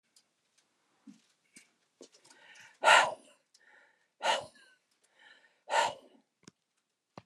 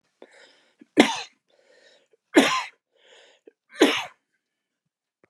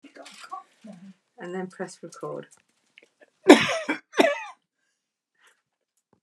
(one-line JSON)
{"exhalation_length": "7.3 s", "exhalation_amplitude": 12151, "exhalation_signal_mean_std_ratio": 0.24, "three_cough_length": "5.3 s", "three_cough_amplitude": 30159, "three_cough_signal_mean_std_ratio": 0.26, "cough_length": "6.2 s", "cough_amplitude": 32536, "cough_signal_mean_std_ratio": 0.24, "survey_phase": "beta (2021-08-13 to 2022-03-07)", "age": "65+", "gender": "Male", "wearing_mask": "No", "symptom_none": true, "smoker_status": "Never smoked", "respiratory_condition_asthma": false, "respiratory_condition_other": false, "recruitment_source": "REACT", "submission_delay": "3 days", "covid_test_result": "Negative", "covid_test_method": "RT-qPCR", "influenza_a_test_result": "Unknown/Void", "influenza_b_test_result": "Unknown/Void"}